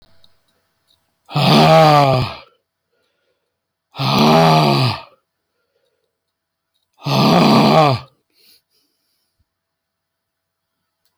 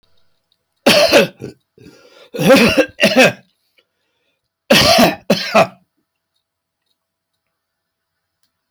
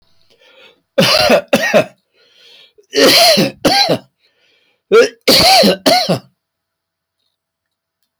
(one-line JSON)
{"exhalation_length": "11.2 s", "exhalation_amplitude": 30632, "exhalation_signal_mean_std_ratio": 0.42, "cough_length": "8.7 s", "cough_amplitude": 30078, "cough_signal_mean_std_ratio": 0.39, "three_cough_length": "8.2 s", "three_cough_amplitude": 32027, "three_cough_signal_mean_std_ratio": 0.5, "survey_phase": "alpha (2021-03-01 to 2021-08-12)", "age": "65+", "gender": "Male", "wearing_mask": "No", "symptom_none": true, "smoker_status": "Never smoked", "respiratory_condition_asthma": false, "respiratory_condition_other": false, "recruitment_source": "REACT", "submission_delay": "1 day", "covid_test_result": "Negative", "covid_test_method": "RT-qPCR"}